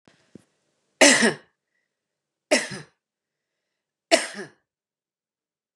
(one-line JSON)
{"three_cough_length": "5.8 s", "three_cough_amplitude": 32754, "three_cough_signal_mean_std_ratio": 0.24, "survey_phase": "beta (2021-08-13 to 2022-03-07)", "age": "45-64", "gender": "Female", "wearing_mask": "No", "symptom_none": true, "smoker_status": "Never smoked", "respiratory_condition_asthma": false, "respiratory_condition_other": false, "recruitment_source": "Test and Trace", "submission_delay": "1 day", "covid_test_result": "Negative", "covid_test_method": "RT-qPCR"}